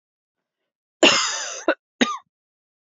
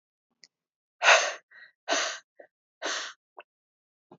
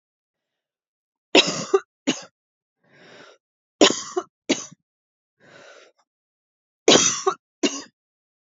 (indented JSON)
{
  "cough_length": "2.8 s",
  "cough_amplitude": 27712,
  "cough_signal_mean_std_ratio": 0.34,
  "exhalation_length": "4.2 s",
  "exhalation_amplitude": 20302,
  "exhalation_signal_mean_std_ratio": 0.29,
  "three_cough_length": "8.5 s",
  "three_cough_amplitude": 32664,
  "three_cough_signal_mean_std_ratio": 0.27,
  "survey_phase": "alpha (2021-03-01 to 2021-08-12)",
  "age": "18-44",
  "gender": "Female",
  "wearing_mask": "No",
  "symptom_cough_any": true,
  "symptom_fever_high_temperature": true,
  "symptom_headache": true,
  "symptom_change_to_sense_of_smell_or_taste": true,
  "symptom_onset": "3 days",
  "smoker_status": "Never smoked",
  "respiratory_condition_asthma": false,
  "respiratory_condition_other": false,
  "recruitment_source": "Test and Trace",
  "submission_delay": "1 day",
  "covid_test_result": "Positive",
  "covid_test_method": "RT-qPCR",
  "covid_ct_value": 19.3,
  "covid_ct_gene": "ORF1ab gene",
  "covid_ct_mean": 20.3,
  "covid_viral_load": "220000 copies/ml",
  "covid_viral_load_category": "Low viral load (10K-1M copies/ml)"
}